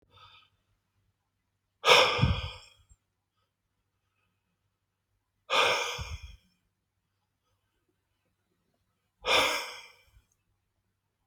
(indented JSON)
{
  "exhalation_length": "11.3 s",
  "exhalation_amplitude": 15790,
  "exhalation_signal_mean_std_ratio": 0.28,
  "survey_phase": "alpha (2021-03-01 to 2021-08-12)",
  "age": "65+",
  "gender": "Male",
  "wearing_mask": "No",
  "symptom_none": true,
  "symptom_shortness_of_breath": true,
  "smoker_status": "Never smoked",
  "respiratory_condition_asthma": false,
  "respiratory_condition_other": true,
  "recruitment_source": "REACT",
  "submission_delay": "2 days",
  "covid_test_result": "Negative",
  "covid_test_method": "RT-qPCR"
}